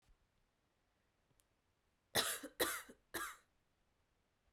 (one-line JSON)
{"three_cough_length": "4.5 s", "three_cough_amplitude": 3085, "three_cough_signal_mean_std_ratio": 0.29, "survey_phase": "beta (2021-08-13 to 2022-03-07)", "age": "18-44", "gender": "Female", "wearing_mask": "No", "symptom_cough_any": true, "symptom_runny_or_blocked_nose": true, "symptom_shortness_of_breath": true, "symptom_headache": true, "symptom_change_to_sense_of_smell_or_taste": true, "symptom_loss_of_taste": true, "symptom_other": true, "symptom_onset": "6 days", "smoker_status": "Never smoked", "respiratory_condition_asthma": false, "respiratory_condition_other": false, "recruitment_source": "Test and Trace", "submission_delay": "2 days", "covid_test_result": "Positive", "covid_test_method": "RT-qPCR", "covid_ct_value": 17.2, "covid_ct_gene": "ORF1ab gene"}